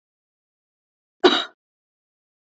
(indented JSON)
{
  "cough_length": "2.6 s",
  "cough_amplitude": 27721,
  "cough_signal_mean_std_ratio": 0.19,
  "survey_phase": "alpha (2021-03-01 to 2021-08-12)",
  "age": "18-44",
  "gender": "Female",
  "wearing_mask": "No",
  "symptom_none": true,
  "smoker_status": "Never smoked",
  "respiratory_condition_asthma": false,
  "respiratory_condition_other": false,
  "recruitment_source": "REACT",
  "submission_delay": "2 days",
  "covid_test_result": "Negative",
  "covid_test_method": "RT-qPCR"
}